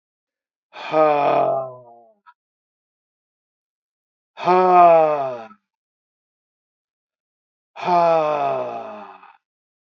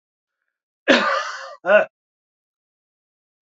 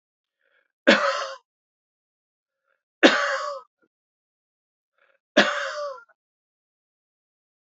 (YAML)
exhalation_length: 9.9 s
exhalation_amplitude: 25970
exhalation_signal_mean_std_ratio: 0.43
cough_length: 3.4 s
cough_amplitude: 27929
cough_signal_mean_std_ratio: 0.33
three_cough_length: 7.7 s
three_cough_amplitude: 27710
three_cough_signal_mean_std_ratio: 0.28
survey_phase: beta (2021-08-13 to 2022-03-07)
age: 65+
gender: Male
wearing_mask: 'No'
symptom_none: true
smoker_status: Never smoked
respiratory_condition_asthma: false
respiratory_condition_other: false
recruitment_source: REACT
submission_delay: 5 days
covid_test_result: Negative
covid_test_method: RT-qPCR
influenza_a_test_result: Negative
influenza_b_test_result: Negative